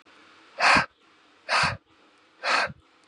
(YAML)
exhalation_length: 3.1 s
exhalation_amplitude: 17163
exhalation_signal_mean_std_ratio: 0.41
survey_phase: beta (2021-08-13 to 2022-03-07)
age: 18-44
gender: Male
wearing_mask: 'No'
symptom_none: true
smoker_status: Never smoked
respiratory_condition_asthma: false
respiratory_condition_other: false
recruitment_source: REACT
submission_delay: 1 day
covid_test_result: Negative
covid_test_method: RT-qPCR
influenza_a_test_result: Negative
influenza_b_test_result: Negative